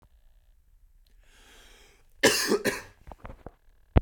{"cough_length": "4.0 s", "cough_amplitude": 23292, "cough_signal_mean_std_ratio": 0.29, "survey_phase": "beta (2021-08-13 to 2022-03-07)", "age": "18-44", "gender": "Male", "wearing_mask": "No", "symptom_none": true, "smoker_status": "Never smoked", "respiratory_condition_asthma": false, "respiratory_condition_other": false, "recruitment_source": "REACT", "submission_delay": "1 day", "covid_test_result": "Negative", "covid_test_method": "RT-qPCR", "influenza_a_test_result": "Negative", "influenza_b_test_result": "Negative"}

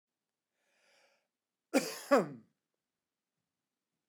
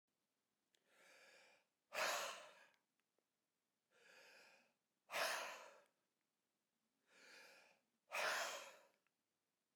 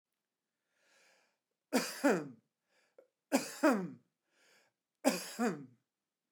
{"cough_length": "4.1 s", "cough_amplitude": 8328, "cough_signal_mean_std_ratio": 0.21, "exhalation_length": "9.8 s", "exhalation_amplitude": 1182, "exhalation_signal_mean_std_ratio": 0.35, "three_cough_length": "6.3 s", "three_cough_amplitude": 5848, "three_cough_signal_mean_std_ratio": 0.32, "survey_phase": "beta (2021-08-13 to 2022-03-07)", "age": "45-64", "gender": "Male", "wearing_mask": "No", "symptom_none": true, "smoker_status": "Never smoked", "respiratory_condition_asthma": true, "respiratory_condition_other": false, "recruitment_source": "REACT", "submission_delay": "4 days", "covid_test_result": "Negative", "covid_test_method": "RT-qPCR"}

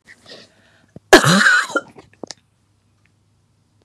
{"cough_length": "3.8 s", "cough_amplitude": 32768, "cough_signal_mean_std_ratio": 0.31, "survey_phase": "beta (2021-08-13 to 2022-03-07)", "age": "45-64", "gender": "Female", "wearing_mask": "No", "symptom_cough_any": true, "symptom_runny_or_blocked_nose": true, "symptom_sore_throat": true, "symptom_abdominal_pain": true, "symptom_diarrhoea": true, "symptom_fatigue": true, "symptom_headache": true, "symptom_change_to_sense_of_smell_or_taste": true, "symptom_loss_of_taste": true, "symptom_other": true, "symptom_onset": "3 days", "smoker_status": "Never smoked", "respiratory_condition_asthma": false, "respiratory_condition_other": false, "recruitment_source": "Test and Trace", "submission_delay": "1 day", "covid_test_result": "Positive", "covid_test_method": "RT-qPCR", "covid_ct_value": 23.3, "covid_ct_gene": "ORF1ab gene", "covid_ct_mean": 23.7, "covid_viral_load": "17000 copies/ml", "covid_viral_load_category": "Low viral load (10K-1M copies/ml)"}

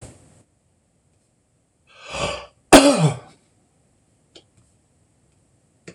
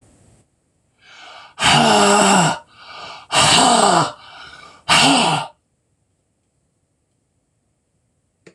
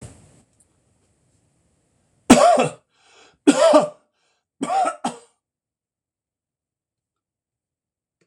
{"cough_length": "5.9 s", "cough_amplitude": 26028, "cough_signal_mean_std_ratio": 0.23, "exhalation_length": "8.5 s", "exhalation_amplitude": 26028, "exhalation_signal_mean_std_ratio": 0.46, "three_cough_length": "8.3 s", "three_cough_amplitude": 26028, "three_cough_signal_mean_std_ratio": 0.28, "survey_phase": "beta (2021-08-13 to 2022-03-07)", "age": "65+", "gender": "Male", "wearing_mask": "No", "symptom_none": true, "smoker_status": "Ex-smoker", "respiratory_condition_asthma": false, "respiratory_condition_other": false, "recruitment_source": "REACT", "submission_delay": "2 days", "covid_test_result": "Negative", "covid_test_method": "RT-qPCR", "influenza_a_test_result": "Unknown/Void", "influenza_b_test_result": "Unknown/Void"}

